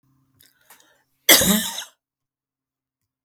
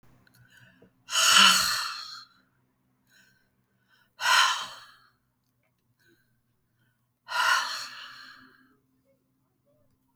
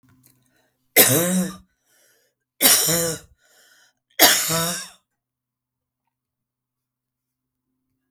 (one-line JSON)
{"cough_length": "3.2 s", "cough_amplitude": 32768, "cough_signal_mean_std_ratio": 0.27, "exhalation_length": "10.2 s", "exhalation_amplitude": 21682, "exhalation_signal_mean_std_ratio": 0.32, "three_cough_length": "8.1 s", "three_cough_amplitude": 32768, "three_cough_signal_mean_std_ratio": 0.34, "survey_phase": "beta (2021-08-13 to 2022-03-07)", "age": "45-64", "gender": "Female", "wearing_mask": "No", "symptom_sore_throat": true, "smoker_status": "Never smoked", "respiratory_condition_asthma": false, "respiratory_condition_other": false, "recruitment_source": "Test and Trace", "submission_delay": "1 day", "covid_test_result": "Negative", "covid_test_method": "RT-qPCR"}